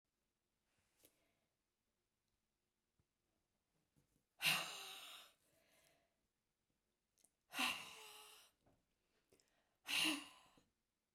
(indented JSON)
{
  "exhalation_length": "11.1 s",
  "exhalation_amplitude": 2006,
  "exhalation_signal_mean_std_ratio": 0.27,
  "survey_phase": "beta (2021-08-13 to 2022-03-07)",
  "age": "65+",
  "gender": "Female",
  "wearing_mask": "No",
  "symptom_none": true,
  "smoker_status": "Never smoked",
  "respiratory_condition_asthma": false,
  "respiratory_condition_other": false,
  "recruitment_source": "REACT",
  "submission_delay": "1 day",
  "covid_test_result": "Negative",
  "covid_test_method": "RT-qPCR"
}